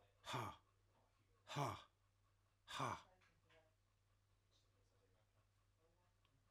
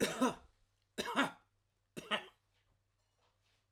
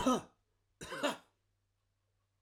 {"exhalation_length": "6.5 s", "exhalation_amplitude": 896, "exhalation_signal_mean_std_ratio": 0.33, "three_cough_length": "3.7 s", "three_cough_amplitude": 3955, "three_cough_signal_mean_std_ratio": 0.34, "cough_length": "2.4 s", "cough_amplitude": 3107, "cough_signal_mean_std_ratio": 0.33, "survey_phase": "alpha (2021-03-01 to 2021-08-12)", "age": "45-64", "gender": "Male", "wearing_mask": "No", "symptom_none": true, "smoker_status": "Ex-smoker", "respiratory_condition_asthma": false, "respiratory_condition_other": false, "recruitment_source": "REACT", "submission_delay": "1 day", "covid_test_result": "Negative", "covid_test_method": "RT-qPCR"}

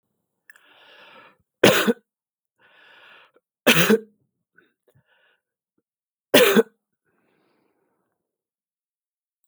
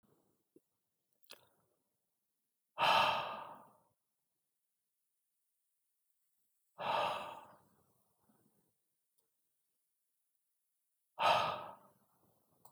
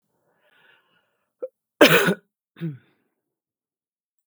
{"three_cough_length": "9.5 s", "three_cough_amplitude": 32768, "three_cough_signal_mean_std_ratio": 0.24, "exhalation_length": "12.7 s", "exhalation_amplitude": 3779, "exhalation_signal_mean_std_ratio": 0.27, "cough_length": "4.3 s", "cough_amplitude": 32768, "cough_signal_mean_std_ratio": 0.23, "survey_phase": "beta (2021-08-13 to 2022-03-07)", "age": "45-64", "gender": "Female", "wearing_mask": "No", "symptom_shortness_of_breath": true, "smoker_status": "Ex-smoker", "respiratory_condition_asthma": false, "respiratory_condition_other": false, "recruitment_source": "REACT", "submission_delay": "2 days", "covid_test_result": "Negative", "covid_test_method": "RT-qPCR", "influenza_a_test_result": "Negative", "influenza_b_test_result": "Negative"}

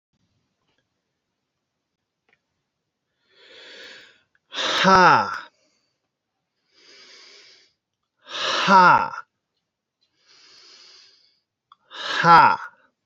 {"exhalation_length": "13.1 s", "exhalation_amplitude": 28210, "exhalation_signal_mean_std_ratio": 0.29, "survey_phase": "beta (2021-08-13 to 2022-03-07)", "age": "18-44", "gender": "Male", "wearing_mask": "No", "symptom_none": true, "symptom_onset": "4 days", "smoker_status": "Never smoked", "respiratory_condition_asthma": false, "respiratory_condition_other": false, "recruitment_source": "REACT", "submission_delay": "2 days", "covid_test_result": "Negative", "covid_test_method": "RT-qPCR", "influenza_a_test_result": "Negative", "influenza_b_test_result": "Negative"}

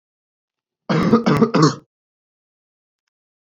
{"cough_length": "3.6 s", "cough_amplitude": 29369, "cough_signal_mean_std_ratio": 0.37, "survey_phase": "alpha (2021-03-01 to 2021-08-12)", "age": "18-44", "gender": "Male", "wearing_mask": "No", "symptom_none": true, "smoker_status": "Never smoked", "respiratory_condition_asthma": false, "respiratory_condition_other": false, "recruitment_source": "REACT", "submission_delay": "5 days", "covid_test_result": "Negative", "covid_test_method": "RT-qPCR"}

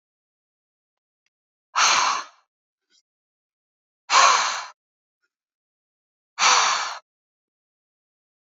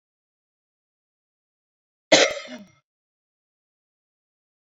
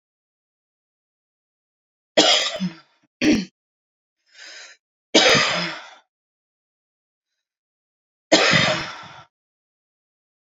{"exhalation_length": "8.5 s", "exhalation_amplitude": 23612, "exhalation_signal_mean_std_ratio": 0.32, "cough_length": "4.8 s", "cough_amplitude": 29717, "cough_signal_mean_std_ratio": 0.17, "three_cough_length": "10.6 s", "three_cough_amplitude": 29503, "three_cough_signal_mean_std_ratio": 0.33, "survey_phase": "beta (2021-08-13 to 2022-03-07)", "age": "45-64", "gender": "Female", "wearing_mask": "No", "symptom_none": true, "smoker_status": "Current smoker (1 to 10 cigarettes per day)", "respiratory_condition_asthma": false, "respiratory_condition_other": false, "recruitment_source": "REACT", "submission_delay": "2 days", "covid_test_result": "Negative", "covid_test_method": "RT-qPCR"}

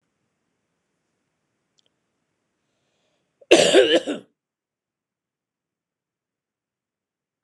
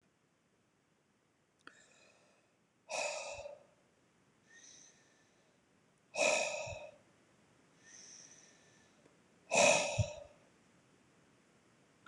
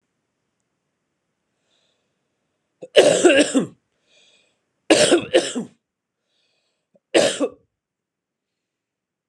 {"cough_length": "7.4 s", "cough_amplitude": 26028, "cough_signal_mean_std_ratio": 0.2, "exhalation_length": "12.1 s", "exhalation_amplitude": 6066, "exhalation_signal_mean_std_ratio": 0.29, "three_cough_length": "9.3 s", "three_cough_amplitude": 26028, "three_cough_signal_mean_std_ratio": 0.3, "survey_phase": "beta (2021-08-13 to 2022-03-07)", "age": "45-64", "gender": "Male", "wearing_mask": "No", "symptom_none": true, "smoker_status": "Never smoked", "respiratory_condition_asthma": false, "respiratory_condition_other": false, "recruitment_source": "REACT", "submission_delay": "3 days", "covid_test_result": "Negative", "covid_test_method": "RT-qPCR", "influenza_a_test_result": "Negative", "influenza_b_test_result": "Negative"}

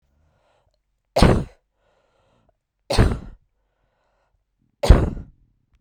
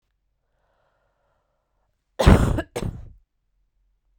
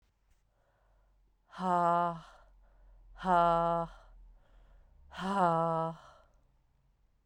{"three_cough_length": "5.8 s", "three_cough_amplitude": 32768, "three_cough_signal_mean_std_ratio": 0.26, "cough_length": "4.2 s", "cough_amplitude": 32768, "cough_signal_mean_std_ratio": 0.25, "exhalation_length": "7.3 s", "exhalation_amplitude": 6050, "exhalation_signal_mean_std_ratio": 0.43, "survey_phase": "beta (2021-08-13 to 2022-03-07)", "age": "18-44", "gender": "Female", "wearing_mask": "No", "symptom_headache": true, "smoker_status": "Never smoked", "respiratory_condition_asthma": false, "respiratory_condition_other": false, "recruitment_source": "REACT", "submission_delay": "2 days", "covid_test_result": "Negative", "covid_test_method": "RT-qPCR", "influenza_a_test_result": "Unknown/Void", "influenza_b_test_result": "Unknown/Void"}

